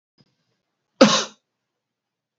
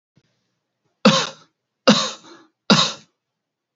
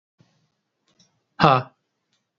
{"cough_length": "2.4 s", "cough_amplitude": 27696, "cough_signal_mean_std_ratio": 0.22, "three_cough_length": "3.8 s", "three_cough_amplitude": 31471, "three_cough_signal_mean_std_ratio": 0.31, "exhalation_length": "2.4 s", "exhalation_amplitude": 32699, "exhalation_signal_mean_std_ratio": 0.21, "survey_phase": "beta (2021-08-13 to 2022-03-07)", "age": "18-44", "gender": "Male", "wearing_mask": "No", "symptom_none": true, "symptom_onset": "12 days", "smoker_status": "Never smoked", "respiratory_condition_asthma": false, "respiratory_condition_other": false, "recruitment_source": "REACT", "submission_delay": "3 days", "covid_test_result": "Negative", "covid_test_method": "RT-qPCR"}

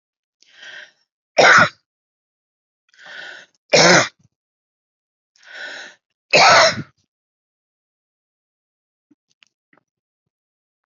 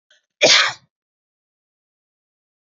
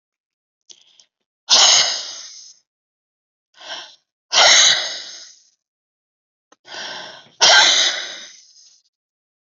{"three_cough_length": "10.9 s", "three_cough_amplitude": 30872, "three_cough_signal_mean_std_ratio": 0.27, "cough_length": "2.7 s", "cough_amplitude": 31196, "cough_signal_mean_std_ratio": 0.26, "exhalation_length": "9.5 s", "exhalation_amplitude": 32768, "exhalation_signal_mean_std_ratio": 0.37, "survey_phase": "beta (2021-08-13 to 2022-03-07)", "age": "45-64", "gender": "Female", "wearing_mask": "No", "symptom_shortness_of_breath": true, "symptom_sore_throat": true, "symptom_fatigue": true, "symptom_headache": true, "symptom_other": true, "smoker_status": "Never smoked", "respiratory_condition_asthma": true, "respiratory_condition_other": false, "recruitment_source": "Test and Trace", "submission_delay": "2 days", "covid_test_result": "Positive", "covid_test_method": "RT-qPCR", "covid_ct_value": 34.6, "covid_ct_gene": "ORF1ab gene"}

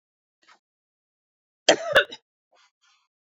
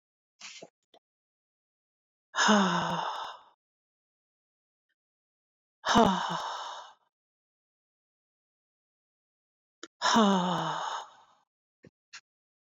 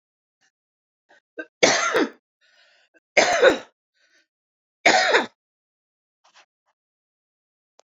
{"cough_length": "3.2 s", "cough_amplitude": 31559, "cough_signal_mean_std_ratio": 0.2, "exhalation_length": "12.6 s", "exhalation_amplitude": 11420, "exhalation_signal_mean_std_ratio": 0.34, "three_cough_length": "7.9 s", "three_cough_amplitude": 28331, "three_cough_signal_mean_std_ratio": 0.3, "survey_phase": "beta (2021-08-13 to 2022-03-07)", "age": "45-64", "gender": "Female", "wearing_mask": "No", "symptom_cough_any": true, "symptom_shortness_of_breath": true, "symptom_fatigue": true, "symptom_change_to_sense_of_smell_or_taste": true, "smoker_status": "Ex-smoker", "respiratory_condition_asthma": false, "respiratory_condition_other": false, "recruitment_source": "REACT", "submission_delay": "1 day", "covid_test_result": "Negative", "covid_test_method": "RT-qPCR"}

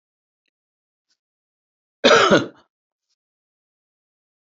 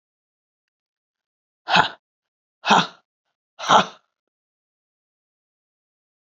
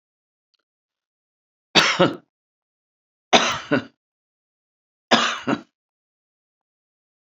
{"cough_length": "4.5 s", "cough_amplitude": 28189, "cough_signal_mean_std_ratio": 0.23, "exhalation_length": "6.4 s", "exhalation_amplitude": 27582, "exhalation_signal_mean_std_ratio": 0.22, "three_cough_length": "7.3 s", "three_cough_amplitude": 31986, "three_cough_signal_mean_std_ratio": 0.27, "survey_phase": "beta (2021-08-13 to 2022-03-07)", "age": "45-64", "gender": "Female", "wearing_mask": "No", "symptom_none": true, "smoker_status": "Current smoker (1 to 10 cigarettes per day)", "respiratory_condition_asthma": false, "respiratory_condition_other": false, "recruitment_source": "REACT", "submission_delay": "2 days", "covid_test_result": "Negative", "covid_test_method": "RT-qPCR", "influenza_a_test_result": "Negative", "influenza_b_test_result": "Negative"}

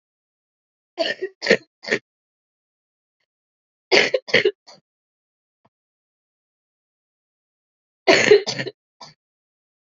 {"three_cough_length": "9.9 s", "three_cough_amplitude": 32767, "three_cough_signal_mean_std_ratio": 0.25, "survey_phase": "alpha (2021-03-01 to 2021-08-12)", "age": "18-44", "gender": "Female", "wearing_mask": "No", "symptom_cough_any": true, "symptom_change_to_sense_of_smell_or_taste": true, "symptom_loss_of_taste": true, "symptom_onset": "4 days", "smoker_status": "Never smoked", "respiratory_condition_asthma": false, "respiratory_condition_other": false, "recruitment_source": "Test and Trace", "submission_delay": "2 days", "covid_test_result": "Positive", "covid_test_method": "RT-qPCR", "covid_ct_value": 15.1, "covid_ct_gene": "ORF1ab gene", "covid_ct_mean": 15.5, "covid_viral_load": "8500000 copies/ml", "covid_viral_load_category": "High viral load (>1M copies/ml)"}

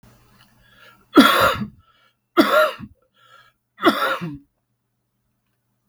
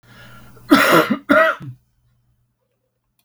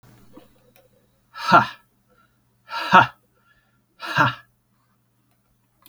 {"three_cough_length": "5.9 s", "three_cough_amplitude": 32768, "three_cough_signal_mean_std_ratio": 0.35, "cough_length": "3.2 s", "cough_amplitude": 32768, "cough_signal_mean_std_ratio": 0.39, "exhalation_length": "5.9 s", "exhalation_amplitude": 32226, "exhalation_signal_mean_std_ratio": 0.25, "survey_phase": "beta (2021-08-13 to 2022-03-07)", "age": "45-64", "gender": "Male", "wearing_mask": "No", "symptom_cough_any": true, "symptom_sore_throat": true, "symptom_fatigue": true, "symptom_headache": true, "symptom_loss_of_taste": true, "symptom_onset": "5 days", "smoker_status": "Never smoked", "respiratory_condition_asthma": false, "respiratory_condition_other": false, "recruitment_source": "Test and Trace", "submission_delay": "2 days", "covid_test_result": "Positive", "covid_test_method": "RT-qPCR", "covid_ct_value": 18.9, "covid_ct_gene": "N gene", "covid_ct_mean": 19.4, "covid_viral_load": "440000 copies/ml", "covid_viral_load_category": "Low viral load (10K-1M copies/ml)"}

